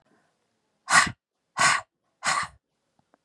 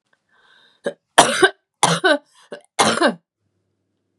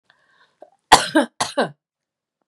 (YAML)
exhalation_length: 3.2 s
exhalation_amplitude: 18733
exhalation_signal_mean_std_ratio: 0.33
three_cough_length: 4.2 s
three_cough_amplitude: 32768
three_cough_signal_mean_std_ratio: 0.36
cough_length: 2.5 s
cough_amplitude: 32768
cough_signal_mean_std_ratio: 0.28
survey_phase: beta (2021-08-13 to 2022-03-07)
age: 45-64
gender: Female
wearing_mask: 'No'
symptom_runny_or_blocked_nose: true
symptom_sore_throat: true
symptom_fatigue: true
symptom_onset: 9 days
smoker_status: Never smoked
respiratory_condition_asthma: false
respiratory_condition_other: false
recruitment_source: REACT
submission_delay: 3 days
covid_test_result: Negative
covid_test_method: RT-qPCR
influenza_a_test_result: Negative
influenza_b_test_result: Negative